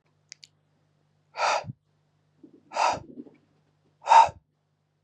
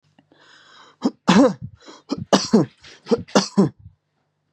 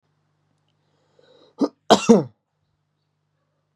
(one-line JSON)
{"exhalation_length": "5.0 s", "exhalation_amplitude": 17594, "exhalation_signal_mean_std_ratio": 0.26, "three_cough_length": "4.5 s", "three_cough_amplitude": 30466, "three_cough_signal_mean_std_ratio": 0.37, "cough_length": "3.8 s", "cough_amplitude": 32643, "cough_signal_mean_std_ratio": 0.21, "survey_phase": "beta (2021-08-13 to 2022-03-07)", "age": "18-44", "gender": "Male", "wearing_mask": "No", "symptom_none": true, "smoker_status": "Never smoked", "respiratory_condition_asthma": false, "respiratory_condition_other": false, "recruitment_source": "REACT", "submission_delay": "1 day", "covid_test_result": "Negative", "covid_test_method": "RT-qPCR", "influenza_a_test_result": "Negative", "influenza_b_test_result": "Negative"}